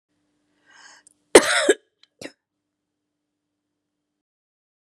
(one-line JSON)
{"cough_length": "4.9 s", "cough_amplitude": 32768, "cough_signal_mean_std_ratio": 0.17, "survey_phase": "beta (2021-08-13 to 2022-03-07)", "age": "45-64", "gender": "Female", "wearing_mask": "No", "symptom_shortness_of_breath": true, "symptom_fatigue": true, "symptom_headache": true, "symptom_onset": "12 days", "smoker_status": "Ex-smoker", "respiratory_condition_asthma": false, "respiratory_condition_other": true, "recruitment_source": "REACT", "submission_delay": "1 day", "covid_test_result": "Negative", "covid_test_method": "RT-qPCR", "influenza_a_test_result": "Negative", "influenza_b_test_result": "Negative"}